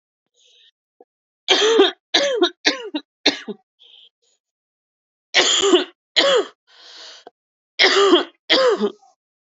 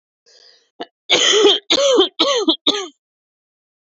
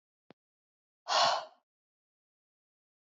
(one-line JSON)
{"three_cough_length": "9.6 s", "three_cough_amplitude": 31072, "three_cough_signal_mean_std_ratio": 0.45, "cough_length": "3.8 s", "cough_amplitude": 31175, "cough_signal_mean_std_ratio": 0.52, "exhalation_length": "3.2 s", "exhalation_amplitude": 5990, "exhalation_signal_mean_std_ratio": 0.26, "survey_phase": "beta (2021-08-13 to 2022-03-07)", "age": "18-44", "gender": "Female", "wearing_mask": "No", "symptom_cough_any": true, "symptom_runny_or_blocked_nose": true, "symptom_shortness_of_breath": true, "symptom_sore_throat": true, "symptom_abdominal_pain": true, "symptom_fatigue": true, "symptom_fever_high_temperature": true, "symptom_headache": true, "symptom_change_to_sense_of_smell_or_taste": true, "symptom_onset": "3 days", "smoker_status": "Never smoked", "respiratory_condition_asthma": false, "respiratory_condition_other": false, "recruitment_source": "Test and Trace", "submission_delay": "1 day", "covid_test_result": "Positive", "covid_test_method": "RT-qPCR"}